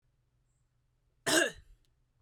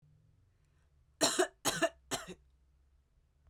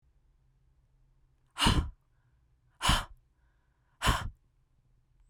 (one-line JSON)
{"cough_length": "2.2 s", "cough_amplitude": 7448, "cough_signal_mean_std_ratio": 0.27, "three_cough_length": "3.5 s", "three_cough_amplitude": 6360, "three_cough_signal_mean_std_ratio": 0.32, "exhalation_length": "5.3 s", "exhalation_amplitude": 9312, "exhalation_signal_mean_std_ratio": 0.3, "survey_phase": "beta (2021-08-13 to 2022-03-07)", "age": "18-44", "gender": "Female", "wearing_mask": "No", "symptom_fatigue": true, "smoker_status": "Never smoked", "respiratory_condition_asthma": false, "respiratory_condition_other": false, "recruitment_source": "REACT", "submission_delay": "1 day", "covid_test_result": "Negative", "covid_test_method": "RT-qPCR"}